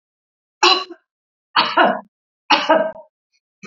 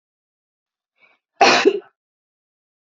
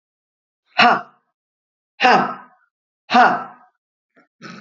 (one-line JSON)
{"three_cough_length": "3.7 s", "three_cough_amplitude": 32767, "three_cough_signal_mean_std_ratio": 0.4, "cough_length": "2.8 s", "cough_amplitude": 30308, "cough_signal_mean_std_ratio": 0.27, "exhalation_length": "4.6 s", "exhalation_amplitude": 29964, "exhalation_signal_mean_std_ratio": 0.34, "survey_phase": "beta (2021-08-13 to 2022-03-07)", "age": "45-64", "gender": "Female", "wearing_mask": "No", "symptom_none": true, "smoker_status": "Ex-smoker", "respiratory_condition_asthma": false, "respiratory_condition_other": false, "recruitment_source": "REACT", "submission_delay": "2 days", "covid_test_result": "Negative", "covid_test_method": "RT-qPCR", "influenza_a_test_result": "Negative", "influenza_b_test_result": "Negative"}